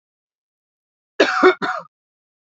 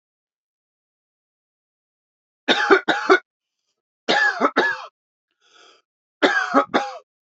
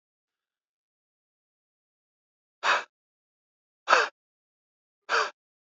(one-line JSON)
{"cough_length": "2.5 s", "cough_amplitude": 27734, "cough_signal_mean_std_ratio": 0.31, "three_cough_length": "7.3 s", "three_cough_amplitude": 30228, "three_cough_signal_mean_std_ratio": 0.36, "exhalation_length": "5.7 s", "exhalation_amplitude": 24290, "exhalation_signal_mean_std_ratio": 0.23, "survey_phase": "beta (2021-08-13 to 2022-03-07)", "age": "18-44", "gender": "Male", "wearing_mask": "No", "symptom_runny_or_blocked_nose": true, "symptom_sore_throat": true, "smoker_status": "Never smoked", "respiratory_condition_asthma": false, "respiratory_condition_other": false, "recruitment_source": "Test and Trace", "submission_delay": "2 days", "covid_test_result": "Positive", "covid_test_method": "RT-qPCR", "covid_ct_value": 26.2, "covid_ct_gene": "ORF1ab gene", "covid_ct_mean": 27.1, "covid_viral_load": "1300 copies/ml", "covid_viral_load_category": "Minimal viral load (< 10K copies/ml)"}